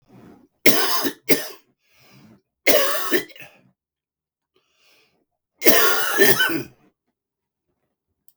three_cough_length: 8.4 s
three_cough_amplitude: 32768
three_cough_signal_mean_std_ratio: 0.39
survey_phase: beta (2021-08-13 to 2022-03-07)
age: 45-64
gender: Male
wearing_mask: 'No'
symptom_none: true
symptom_onset: 3 days
smoker_status: Current smoker (11 or more cigarettes per day)
respiratory_condition_asthma: true
respiratory_condition_other: false
recruitment_source: REACT
submission_delay: 2 days
covid_test_result: Negative
covid_test_method: RT-qPCR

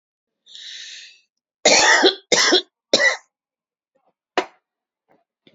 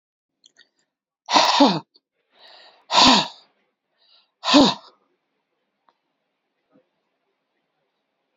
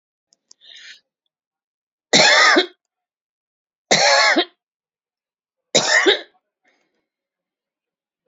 cough_length: 5.5 s
cough_amplitude: 32188
cough_signal_mean_std_ratio: 0.37
exhalation_length: 8.4 s
exhalation_amplitude: 30922
exhalation_signal_mean_std_ratio: 0.28
three_cough_length: 8.3 s
three_cough_amplitude: 32768
three_cough_signal_mean_std_ratio: 0.35
survey_phase: alpha (2021-03-01 to 2021-08-12)
age: 65+
gender: Female
wearing_mask: 'No'
symptom_none: true
smoker_status: Ex-smoker
respiratory_condition_asthma: false
respiratory_condition_other: false
recruitment_source: REACT
submission_delay: 3 days
covid_test_result: Negative
covid_test_method: RT-qPCR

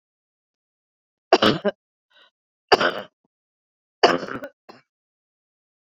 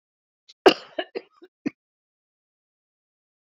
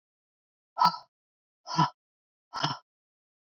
three_cough_length: 5.9 s
three_cough_amplitude: 27642
three_cough_signal_mean_std_ratio: 0.24
cough_length: 3.4 s
cough_amplitude: 26993
cough_signal_mean_std_ratio: 0.14
exhalation_length: 3.5 s
exhalation_amplitude: 11792
exhalation_signal_mean_std_ratio: 0.27
survey_phase: beta (2021-08-13 to 2022-03-07)
age: 45-64
gender: Female
wearing_mask: 'No'
symptom_cough_any: true
symptom_headache: true
symptom_onset: 8 days
smoker_status: Never smoked
respiratory_condition_asthma: false
respiratory_condition_other: false
recruitment_source: REACT
submission_delay: 3 days
covid_test_result: Negative
covid_test_method: RT-qPCR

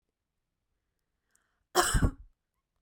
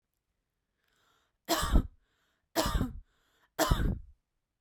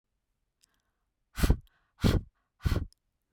cough_length: 2.8 s
cough_amplitude: 13477
cough_signal_mean_std_ratio: 0.27
three_cough_length: 4.6 s
three_cough_amplitude: 9030
three_cough_signal_mean_std_ratio: 0.37
exhalation_length: 3.3 s
exhalation_amplitude: 10763
exhalation_signal_mean_std_ratio: 0.3
survey_phase: beta (2021-08-13 to 2022-03-07)
age: 18-44
gender: Female
wearing_mask: 'No'
symptom_none: true
smoker_status: Never smoked
respiratory_condition_asthma: false
respiratory_condition_other: false
recruitment_source: REACT
submission_delay: 1 day
covid_test_result: Negative
covid_test_method: RT-qPCR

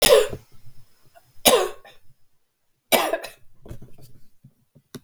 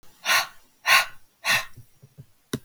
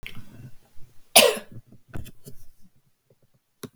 three_cough_length: 5.0 s
three_cough_amplitude: 32768
three_cough_signal_mean_std_ratio: 0.35
exhalation_length: 2.6 s
exhalation_amplitude: 27942
exhalation_signal_mean_std_ratio: 0.41
cough_length: 3.8 s
cough_amplitude: 32768
cough_signal_mean_std_ratio: 0.3
survey_phase: beta (2021-08-13 to 2022-03-07)
age: 45-64
gender: Female
wearing_mask: 'No'
symptom_cough_any: true
symptom_runny_or_blocked_nose: true
symptom_fatigue: true
smoker_status: Never smoked
respiratory_condition_asthma: false
respiratory_condition_other: false
recruitment_source: Test and Trace
submission_delay: 2 days
covid_test_result: Positive
covid_test_method: RT-qPCR
covid_ct_value: 16.5
covid_ct_gene: ORF1ab gene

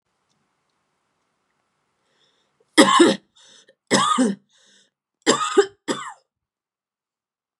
three_cough_length: 7.6 s
three_cough_amplitude: 30913
three_cough_signal_mean_std_ratio: 0.31
survey_phase: beta (2021-08-13 to 2022-03-07)
age: 18-44
gender: Female
wearing_mask: 'No'
symptom_headache: true
smoker_status: Never smoked
respiratory_condition_asthma: false
respiratory_condition_other: false
recruitment_source: Test and Trace
submission_delay: 1 day
covid_test_result: Positive
covid_test_method: RT-qPCR
covid_ct_value: 32.5
covid_ct_gene: ORF1ab gene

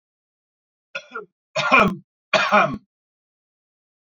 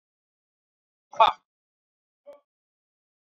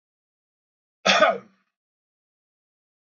three_cough_length: 4.1 s
three_cough_amplitude: 26983
three_cough_signal_mean_std_ratio: 0.35
exhalation_length: 3.2 s
exhalation_amplitude: 19552
exhalation_signal_mean_std_ratio: 0.14
cough_length: 3.2 s
cough_amplitude: 21599
cough_signal_mean_std_ratio: 0.24
survey_phase: beta (2021-08-13 to 2022-03-07)
age: 45-64
gender: Male
wearing_mask: 'No'
symptom_none: true
smoker_status: Current smoker (1 to 10 cigarettes per day)
respiratory_condition_asthma: true
respiratory_condition_other: false
recruitment_source: REACT
submission_delay: 2 days
covid_test_result: Negative
covid_test_method: RT-qPCR
influenza_a_test_result: Negative
influenza_b_test_result: Negative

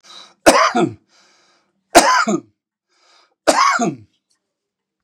three_cough_length: 5.0 s
three_cough_amplitude: 32768
three_cough_signal_mean_std_ratio: 0.4
survey_phase: beta (2021-08-13 to 2022-03-07)
age: 65+
gender: Male
wearing_mask: 'No'
symptom_none: true
smoker_status: Ex-smoker
respiratory_condition_asthma: false
respiratory_condition_other: false
recruitment_source: REACT
submission_delay: 2 days
covid_test_result: Negative
covid_test_method: RT-qPCR
influenza_a_test_result: Negative
influenza_b_test_result: Negative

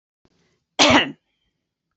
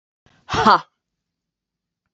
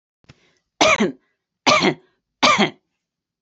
cough_length: 2.0 s
cough_amplitude: 27719
cough_signal_mean_std_ratio: 0.3
exhalation_length: 2.1 s
exhalation_amplitude: 27699
exhalation_signal_mean_std_ratio: 0.26
three_cough_length: 3.4 s
three_cough_amplitude: 32767
three_cough_signal_mean_std_ratio: 0.4
survey_phase: beta (2021-08-13 to 2022-03-07)
age: 65+
gender: Female
wearing_mask: 'No'
symptom_none: true
smoker_status: Never smoked
respiratory_condition_asthma: false
respiratory_condition_other: false
recruitment_source: REACT
submission_delay: 2 days
covid_test_result: Negative
covid_test_method: RT-qPCR
influenza_a_test_result: Negative
influenza_b_test_result: Negative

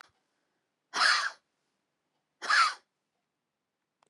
exhalation_length: 4.1 s
exhalation_amplitude: 8428
exhalation_signal_mean_std_ratio: 0.31
survey_phase: beta (2021-08-13 to 2022-03-07)
age: 65+
gender: Female
wearing_mask: 'No'
symptom_shortness_of_breath: true
symptom_fatigue: true
smoker_status: Ex-smoker
respiratory_condition_asthma: true
respiratory_condition_other: false
recruitment_source: REACT
submission_delay: 2 days
covid_test_result: Negative
covid_test_method: RT-qPCR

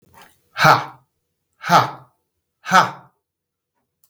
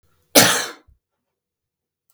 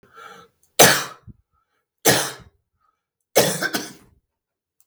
exhalation_length: 4.1 s
exhalation_amplitude: 32768
exhalation_signal_mean_std_ratio: 0.31
cough_length: 2.1 s
cough_amplitude: 32768
cough_signal_mean_std_ratio: 0.28
three_cough_length: 4.9 s
three_cough_amplitude: 32768
three_cough_signal_mean_std_ratio: 0.31
survey_phase: beta (2021-08-13 to 2022-03-07)
age: 45-64
gender: Male
wearing_mask: 'No'
symptom_headache: true
smoker_status: Ex-smoker
respiratory_condition_asthma: false
respiratory_condition_other: false
recruitment_source: Test and Trace
submission_delay: 0 days
covid_test_result: Negative
covid_test_method: LFT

